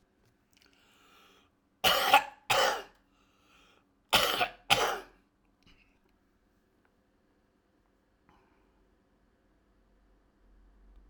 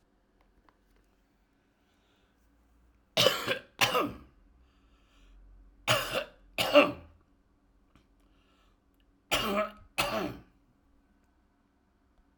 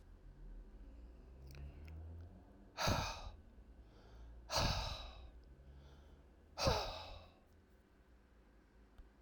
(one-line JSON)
{"cough_length": "11.1 s", "cough_amplitude": 16621, "cough_signal_mean_std_ratio": 0.27, "three_cough_length": "12.4 s", "three_cough_amplitude": 14725, "three_cough_signal_mean_std_ratio": 0.3, "exhalation_length": "9.2 s", "exhalation_amplitude": 2920, "exhalation_signal_mean_std_ratio": 0.49, "survey_phase": "alpha (2021-03-01 to 2021-08-12)", "age": "65+", "gender": "Male", "wearing_mask": "No", "symptom_none": true, "smoker_status": "Ex-smoker", "respiratory_condition_asthma": false, "respiratory_condition_other": false, "recruitment_source": "REACT", "submission_delay": "1 day", "covid_test_result": "Negative", "covid_test_method": "RT-qPCR"}